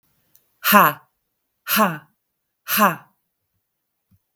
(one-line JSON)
{"exhalation_length": "4.4 s", "exhalation_amplitude": 32766, "exhalation_signal_mean_std_ratio": 0.32, "survey_phase": "beta (2021-08-13 to 2022-03-07)", "age": "45-64", "gender": "Female", "wearing_mask": "No", "symptom_none": true, "symptom_onset": "4 days", "smoker_status": "Ex-smoker", "respiratory_condition_asthma": false, "respiratory_condition_other": false, "recruitment_source": "REACT", "submission_delay": "1 day", "covid_test_result": "Negative", "covid_test_method": "RT-qPCR"}